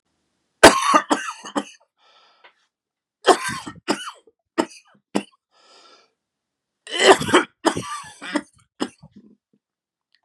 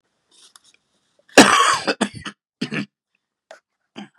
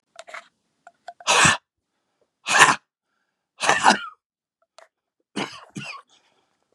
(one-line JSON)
{"three_cough_length": "10.2 s", "three_cough_amplitude": 32768, "three_cough_signal_mean_std_ratio": 0.28, "cough_length": "4.2 s", "cough_amplitude": 32768, "cough_signal_mean_std_ratio": 0.29, "exhalation_length": "6.7 s", "exhalation_amplitude": 32768, "exhalation_signal_mean_std_ratio": 0.3, "survey_phase": "beta (2021-08-13 to 2022-03-07)", "age": "45-64", "gender": "Male", "wearing_mask": "No", "symptom_cough_any": true, "symptom_new_continuous_cough": true, "symptom_runny_or_blocked_nose": true, "symptom_fatigue": true, "symptom_change_to_sense_of_smell_or_taste": true, "symptom_loss_of_taste": true, "symptom_onset": "9 days", "smoker_status": "Ex-smoker", "respiratory_condition_asthma": false, "respiratory_condition_other": false, "recruitment_source": "Test and Trace", "submission_delay": "2 days", "covid_test_result": "Negative", "covid_test_method": "RT-qPCR"}